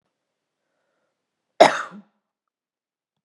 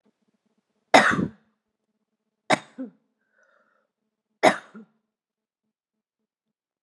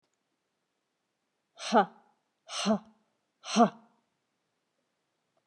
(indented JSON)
{
  "cough_length": "3.2 s",
  "cough_amplitude": 32768,
  "cough_signal_mean_std_ratio": 0.16,
  "three_cough_length": "6.8 s",
  "three_cough_amplitude": 32592,
  "three_cough_signal_mean_std_ratio": 0.2,
  "exhalation_length": "5.5 s",
  "exhalation_amplitude": 12003,
  "exhalation_signal_mean_std_ratio": 0.24,
  "survey_phase": "beta (2021-08-13 to 2022-03-07)",
  "age": "18-44",
  "gender": "Female",
  "wearing_mask": "No",
  "symptom_cough_any": true,
  "symptom_runny_or_blocked_nose": true,
  "symptom_sore_throat": true,
  "smoker_status": "Ex-smoker",
  "respiratory_condition_asthma": false,
  "respiratory_condition_other": false,
  "recruitment_source": "Test and Trace",
  "submission_delay": "1 day",
  "covid_test_result": "Positive",
  "covid_test_method": "LFT"
}